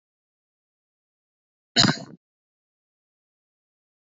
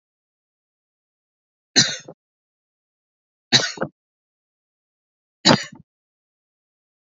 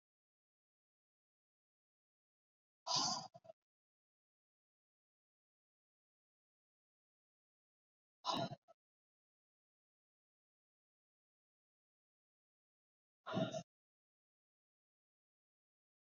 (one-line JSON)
{"cough_length": "4.1 s", "cough_amplitude": 25570, "cough_signal_mean_std_ratio": 0.16, "three_cough_length": "7.2 s", "three_cough_amplitude": 32652, "three_cough_signal_mean_std_ratio": 0.2, "exhalation_length": "16.0 s", "exhalation_amplitude": 1934, "exhalation_signal_mean_std_ratio": 0.19, "survey_phase": "beta (2021-08-13 to 2022-03-07)", "age": "18-44", "gender": "Male", "wearing_mask": "No", "symptom_none": true, "symptom_onset": "12 days", "smoker_status": "Never smoked", "respiratory_condition_asthma": false, "respiratory_condition_other": false, "recruitment_source": "REACT", "submission_delay": "3 days", "covid_test_result": "Negative", "covid_test_method": "RT-qPCR", "influenza_a_test_result": "Negative", "influenza_b_test_result": "Negative"}